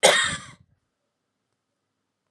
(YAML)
cough_length: 2.3 s
cough_amplitude: 29434
cough_signal_mean_std_ratio: 0.28
survey_phase: alpha (2021-03-01 to 2021-08-12)
age: 18-44
gender: Female
wearing_mask: 'No'
symptom_none: true
smoker_status: Never smoked
respiratory_condition_asthma: false
respiratory_condition_other: false
recruitment_source: Test and Trace
submission_delay: 0 days
covid_test_result: Negative
covid_test_method: LFT